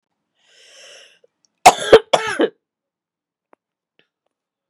{"cough_length": "4.7 s", "cough_amplitude": 32768, "cough_signal_mean_std_ratio": 0.21, "survey_phase": "beta (2021-08-13 to 2022-03-07)", "age": "45-64", "gender": "Female", "wearing_mask": "No", "symptom_cough_any": true, "symptom_runny_or_blocked_nose": true, "symptom_sore_throat": true, "symptom_onset": "3 days", "smoker_status": "Never smoked", "respiratory_condition_asthma": true, "respiratory_condition_other": false, "recruitment_source": "Test and Trace", "submission_delay": "1 day", "covid_test_result": "Positive", "covid_test_method": "RT-qPCR", "covid_ct_value": 17.9, "covid_ct_gene": "ORF1ab gene", "covid_ct_mean": 18.0, "covid_viral_load": "1300000 copies/ml", "covid_viral_load_category": "High viral load (>1M copies/ml)"}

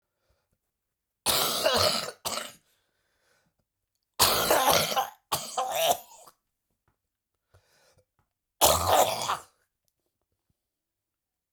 {"three_cough_length": "11.5 s", "three_cough_amplitude": 19518, "three_cough_signal_mean_std_ratio": 0.4, "survey_phase": "beta (2021-08-13 to 2022-03-07)", "age": "65+", "gender": "Male", "wearing_mask": "No", "symptom_cough_any": true, "symptom_new_continuous_cough": true, "symptom_diarrhoea": true, "symptom_fatigue": true, "symptom_onset": "3 days", "smoker_status": "Ex-smoker", "respiratory_condition_asthma": false, "respiratory_condition_other": false, "recruitment_source": "Test and Trace", "submission_delay": "1 day", "covid_test_result": "Positive", "covid_test_method": "RT-qPCR", "covid_ct_value": 20.8, "covid_ct_gene": "N gene"}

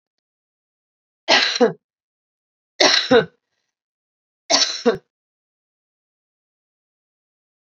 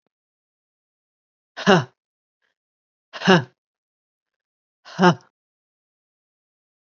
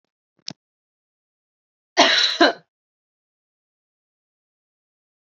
{"three_cough_length": "7.8 s", "three_cough_amplitude": 31419, "three_cough_signal_mean_std_ratio": 0.29, "exhalation_length": "6.8 s", "exhalation_amplitude": 32589, "exhalation_signal_mean_std_ratio": 0.21, "cough_length": "5.2 s", "cough_amplitude": 29394, "cough_signal_mean_std_ratio": 0.23, "survey_phase": "beta (2021-08-13 to 2022-03-07)", "age": "45-64", "gender": "Female", "wearing_mask": "No", "symptom_cough_any": true, "symptom_new_continuous_cough": true, "symptom_runny_or_blocked_nose": true, "symptom_sore_throat": true, "symptom_fatigue": true, "symptom_headache": true, "smoker_status": "Never smoked", "respiratory_condition_asthma": false, "respiratory_condition_other": false, "recruitment_source": "Test and Trace", "submission_delay": "2 days", "covid_test_result": "Positive", "covid_test_method": "LFT"}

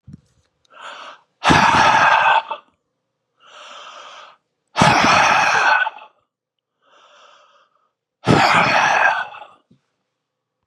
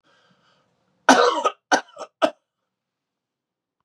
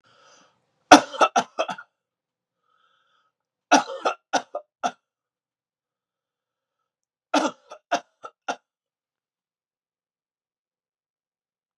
{"exhalation_length": "10.7 s", "exhalation_amplitude": 32431, "exhalation_signal_mean_std_ratio": 0.48, "cough_length": "3.8 s", "cough_amplitude": 32412, "cough_signal_mean_std_ratio": 0.28, "three_cough_length": "11.8 s", "three_cough_amplitude": 32768, "three_cough_signal_mean_std_ratio": 0.19, "survey_phase": "beta (2021-08-13 to 2022-03-07)", "age": "65+", "gender": "Male", "wearing_mask": "No", "symptom_none": true, "smoker_status": "Never smoked", "respiratory_condition_asthma": false, "respiratory_condition_other": false, "recruitment_source": "REACT", "submission_delay": "1 day", "covid_test_result": "Negative", "covid_test_method": "RT-qPCR", "influenza_a_test_result": "Negative", "influenza_b_test_result": "Negative"}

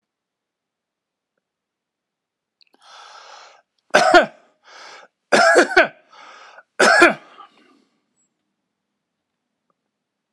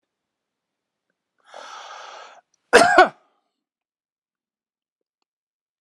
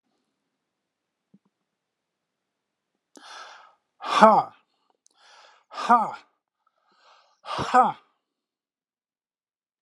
{"three_cough_length": "10.3 s", "three_cough_amplitude": 32768, "three_cough_signal_mean_std_ratio": 0.27, "cough_length": "5.8 s", "cough_amplitude": 32768, "cough_signal_mean_std_ratio": 0.2, "exhalation_length": "9.8 s", "exhalation_amplitude": 31178, "exhalation_signal_mean_std_ratio": 0.23, "survey_phase": "alpha (2021-03-01 to 2021-08-12)", "age": "65+", "gender": "Male", "wearing_mask": "No", "symptom_none": true, "symptom_onset": "12 days", "smoker_status": "Never smoked", "respiratory_condition_asthma": false, "respiratory_condition_other": false, "recruitment_source": "REACT", "submission_delay": "2 days", "covid_test_result": "Negative", "covid_test_method": "RT-qPCR", "covid_ct_value": 41.0, "covid_ct_gene": "N gene"}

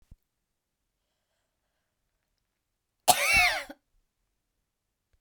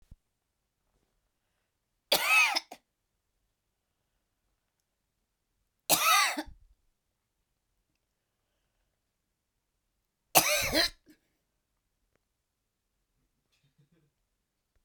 {"cough_length": "5.2 s", "cough_amplitude": 19202, "cough_signal_mean_std_ratio": 0.24, "three_cough_length": "14.8 s", "three_cough_amplitude": 15922, "three_cough_signal_mean_std_ratio": 0.24, "survey_phase": "beta (2021-08-13 to 2022-03-07)", "age": "45-64", "gender": "Female", "wearing_mask": "No", "symptom_none": true, "smoker_status": "Never smoked", "respiratory_condition_asthma": false, "respiratory_condition_other": false, "recruitment_source": "REACT", "submission_delay": "2 days", "covid_test_result": "Negative", "covid_test_method": "RT-qPCR"}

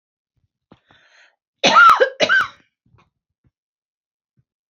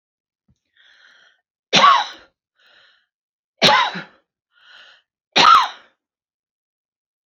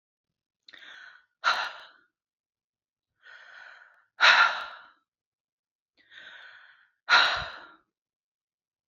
{"cough_length": "4.7 s", "cough_amplitude": 29947, "cough_signal_mean_std_ratio": 0.3, "three_cough_length": "7.3 s", "three_cough_amplitude": 32012, "three_cough_signal_mean_std_ratio": 0.29, "exhalation_length": "8.9 s", "exhalation_amplitude": 21269, "exhalation_signal_mean_std_ratio": 0.27, "survey_phase": "alpha (2021-03-01 to 2021-08-12)", "age": "65+", "gender": "Female", "wearing_mask": "No", "symptom_none": true, "smoker_status": "Ex-smoker", "respiratory_condition_asthma": false, "respiratory_condition_other": false, "recruitment_source": "REACT", "submission_delay": "1 day", "covid_test_result": "Negative", "covid_test_method": "RT-qPCR"}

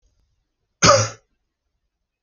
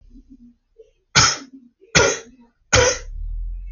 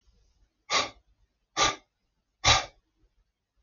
{"cough_length": "2.2 s", "cough_amplitude": 29710, "cough_signal_mean_std_ratio": 0.26, "three_cough_length": "3.7 s", "three_cough_amplitude": 32768, "three_cough_signal_mean_std_ratio": 0.44, "exhalation_length": "3.6 s", "exhalation_amplitude": 14569, "exhalation_signal_mean_std_ratio": 0.29, "survey_phase": "alpha (2021-03-01 to 2021-08-12)", "age": "18-44", "gender": "Male", "wearing_mask": "No", "symptom_none": true, "smoker_status": "Never smoked", "respiratory_condition_asthma": false, "respiratory_condition_other": false, "recruitment_source": "REACT", "submission_delay": "1 day", "covid_test_result": "Negative", "covid_test_method": "RT-qPCR"}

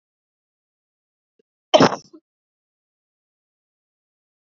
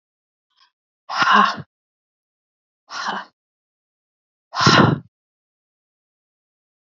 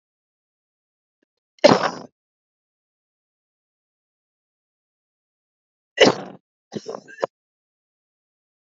{"cough_length": "4.4 s", "cough_amplitude": 30448, "cough_signal_mean_std_ratio": 0.15, "exhalation_length": "6.9 s", "exhalation_amplitude": 28709, "exhalation_signal_mean_std_ratio": 0.29, "three_cough_length": "8.8 s", "three_cough_amplitude": 32570, "three_cough_signal_mean_std_ratio": 0.17, "survey_phase": "beta (2021-08-13 to 2022-03-07)", "age": "18-44", "gender": "Female", "wearing_mask": "No", "symptom_runny_or_blocked_nose": true, "symptom_shortness_of_breath": true, "symptom_sore_throat": true, "symptom_abdominal_pain": true, "symptom_fatigue": true, "symptom_headache": true, "smoker_status": "Never smoked", "respiratory_condition_asthma": false, "respiratory_condition_other": false, "recruitment_source": "Test and Trace", "submission_delay": "2 days", "covid_test_result": "Positive", "covid_test_method": "ePCR"}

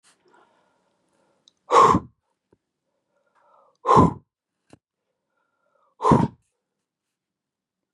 {"exhalation_length": "7.9 s", "exhalation_amplitude": 30179, "exhalation_signal_mean_std_ratio": 0.25, "survey_phase": "beta (2021-08-13 to 2022-03-07)", "age": "65+", "gender": "Female", "wearing_mask": "No", "symptom_none": true, "symptom_onset": "12 days", "smoker_status": "Ex-smoker", "respiratory_condition_asthma": true, "respiratory_condition_other": true, "recruitment_source": "REACT", "submission_delay": "1 day", "covid_test_result": "Negative", "covid_test_method": "RT-qPCR", "influenza_a_test_result": "Unknown/Void", "influenza_b_test_result": "Unknown/Void"}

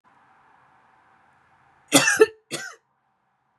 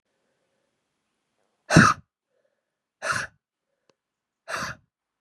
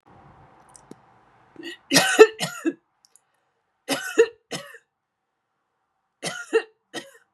{"cough_length": "3.6 s", "cough_amplitude": 27226, "cough_signal_mean_std_ratio": 0.25, "exhalation_length": "5.2 s", "exhalation_amplitude": 30327, "exhalation_signal_mean_std_ratio": 0.21, "three_cough_length": "7.3 s", "three_cough_amplitude": 32768, "three_cough_signal_mean_std_ratio": 0.26, "survey_phase": "beta (2021-08-13 to 2022-03-07)", "age": "18-44", "gender": "Female", "wearing_mask": "No", "symptom_runny_or_blocked_nose": true, "symptom_headache": true, "symptom_change_to_sense_of_smell_or_taste": true, "symptom_onset": "2 days", "smoker_status": "Never smoked", "respiratory_condition_asthma": false, "respiratory_condition_other": false, "recruitment_source": "Test and Trace", "submission_delay": "1 day", "covid_test_result": "Positive", "covid_test_method": "RT-qPCR", "covid_ct_value": 22.7, "covid_ct_gene": "ORF1ab gene"}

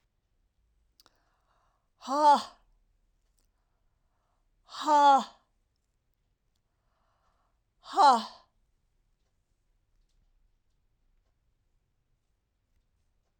{"exhalation_length": "13.4 s", "exhalation_amplitude": 10600, "exhalation_signal_mean_std_ratio": 0.23, "survey_phase": "alpha (2021-03-01 to 2021-08-12)", "age": "65+", "gender": "Female", "wearing_mask": "No", "symptom_none": true, "smoker_status": "Never smoked", "respiratory_condition_asthma": false, "respiratory_condition_other": false, "recruitment_source": "REACT", "submission_delay": "3 days", "covid_test_result": "Negative", "covid_test_method": "RT-qPCR"}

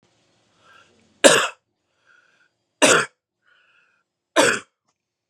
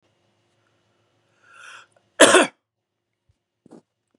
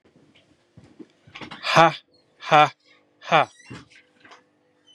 {"three_cough_length": "5.3 s", "three_cough_amplitude": 32768, "three_cough_signal_mean_std_ratio": 0.27, "cough_length": "4.2 s", "cough_amplitude": 32767, "cough_signal_mean_std_ratio": 0.2, "exhalation_length": "4.9 s", "exhalation_amplitude": 32767, "exhalation_signal_mean_std_ratio": 0.26, "survey_phase": "beta (2021-08-13 to 2022-03-07)", "age": "18-44", "gender": "Male", "wearing_mask": "No", "symptom_cough_any": true, "symptom_headache": true, "symptom_other": true, "smoker_status": "Ex-smoker", "respiratory_condition_asthma": false, "respiratory_condition_other": false, "recruitment_source": "Test and Trace", "submission_delay": "1 day", "covid_test_result": "Positive", "covid_test_method": "RT-qPCR", "covid_ct_value": 14.6, "covid_ct_gene": "ORF1ab gene", "covid_ct_mean": 14.9, "covid_viral_load": "13000000 copies/ml", "covid_viral_load_category": "High viral load (>1M copies/ml)"}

